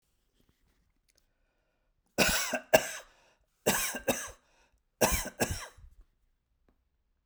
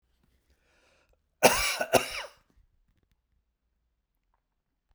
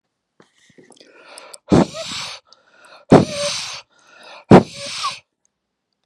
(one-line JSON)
{"three_cough_length": "7.3 s", "three_cough_amplitude": 14460, "three_cough_signal_mean_std_ratio": 0.33, "cough_length": "4.9 s", "cough_amplitude": 23881, "cough_signal_mean_std_ratio": 0.24, "exhalation_length": "6.1 s", "exhalation_amplitude": 32768, "exhalation_signal_mean_std_ratio": 0.28, "survey_phase": "beta (2021-08-13 to 2022-03-07)", "age": "65+", "gender": "Male", "wearing_mask": "No", "symptom_none": true, "smoker_status": "Never smoked", "respiratory_condition_asthma": false, "respiratory_condition_other": false, "recruitment_source": "REACT", "submission_delay": "2 days", "covid_test_result": "Negative", "covid_test_method": "RT-qPCR"}